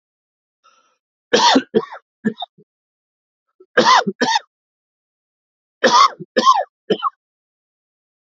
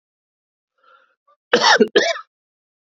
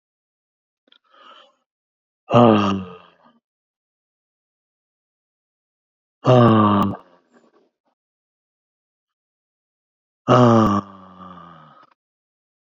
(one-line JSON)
{"three_cough_length": "8.4 s", "three_cough_amplitude": 29415, "three_cough_signal_mean_std_ratio": 0.34, "cough_length": "3.0 s", "cough_amplitude": 28500, "cough_signal_mean_std_ratio": 0.32, "exhalation_length": "12.8 s", "exhalation_amplitude": 27722, "exhalation_signal_mean_std_ratio": 0.3, "survey_phase": "beta (2021-08-13 to 2022-03-07)", "age": "45-64", "gender": "Male", "wearing_mask": "No", "symptom_none": true, "smoker_status": "Never smoked", "respiratory_condition_asthma": false, "respiratory_condition_other": false, "recruitment_source": "REACT", "submission_delay": "2 days", "covid_test_result": "Negative", "covid_test_method": "RT-qPCR", "influenza_a_test_result": "Negative", "influenza_b_test_result": "Negative"}